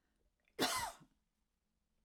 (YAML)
cough_length: 2.0 s
cough_amplitude: 2915
cough_signal_mean_std_ratio: 0.33
survey_phase: alpha (2021-03-01 to 2021-08-12)
age: 65+
gender: Female
wearing_mask: 'No'
symptom_cough_any: true
symptom_onset: 5 days
smoker_status: Never smoked
respiratory_condition_asthma: false
respiratory_condition_other: false
recruitment_source: REACT
submission_delay: 1 day
covid_test_result: Negative
covid_test_method: RT-qPCR